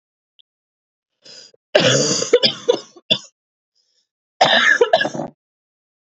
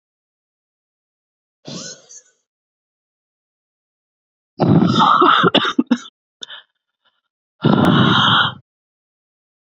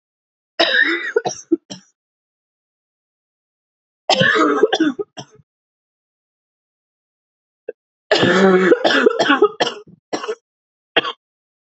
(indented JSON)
{
  "cough_length": "6.1 s",
  "cough_amplitude": 31906,
  "cough_signal_mean_std_ratio": 0.4,
  "exhalation_length": "9.6 s",
  "exhalation_amplitude": 28589,
  "exhalation_signal_mean_std_ratio": 0.39,
  "three_cough_length": "11.7 s",
  "three_cough_amplitude": 30370,
  "three_cough_signal_mean_std_ratio": 0.41,
  "survey_phase": "beta (2021-08-13 to 2022-03-07)",
  "age": "18-44",
  "gender": "Female",
  "wearing_mask": "No",
  "symptom_cough_any": true,
  "symptom_new_continuous_cough": true,
  "symptom_runny_or_blocked_nose": true,
  "symptom_shortness_of_breath": true,
  "symptom_sore_throat": true,
  "symptom_fatigue": true,
  "symptom_headache": true,
  "symptom_change_to_sense_of_smell_or_taste": true,
  "smoker_status": "Never smoked",
  "respiratory_condition_asthma": false,
  "respiratory_condition_other": false,
  "recruitment_source": "Test and Trace",
  "submission_delay": "1 day",
  "covid_test_result": "Positive",
  "covid_test_method": "LFT"
}